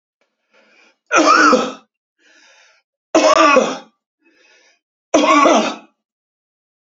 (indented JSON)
{
  "three_cough_length": "6.8 s",
  "three_cough_amplitude": 32565,
  "three_cough_signal_mean_std_ratio": 0.43,
  "survey_phase": "beta (2021-08-13 to 2022-03-07)",
  "age": "45-64",
  "gender": "Male",
  "wearing_mask": "No",
  "symptom_none": true,
  "smoker_status": "Ex-smoker",
  "respiratory_condition_asthma": false,
  "respiratory_condition_other": false,
  "recruitment_source": "REACT",
  "submission_delay": "1 day",
  "covid_test_result": "Negative",
  "covid_test_method": "RT-qPCR",
  "influenza_a_test_result": "Negative",
  "influenza_b_test_result": "Negative"
}